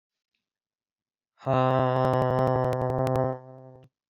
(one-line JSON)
{"exhalation_length": "4.1 s", "exhalation_amplitude": 11546, "exhalation_signal_mean_std_ratio": 0.5, "survey_phase": "beta (2021-08-13 to 2022-03-07)", "age": "18-44", "gender": "Male", "wearing_mask": "Yes", "symptom_cough_any": true, "symptom_new_continuous_cough": true, "symptom_runny_or_blocked_nose": true, "symptom_shortness_of_breath": true, "symptom_sore_throat": true, "symptom_fever_high_temperature": true, "symptom_headache": true, "symptom_change_to_sense_of_smell_or_taste": true, "symptom_onset": "3 days", "smoker_status": "Never smoked", "respiratory_condition_asthma": false, "respiratory_condition_other": false, "recruitment_source": "Test and Trace", "submission_delay": "2 days", "covid_test_result": "Positive", "covid_test_method": "RT-qPCR", "covid_ct_value": 18.8, "covid_ct_gene": "ORF1ab gene", "covid_ct_mean": 19.7, "covid_viral_load": "330000 copies/ml", "covid_viral_load_category": "Low viral load (10K-1M copies/ml)"}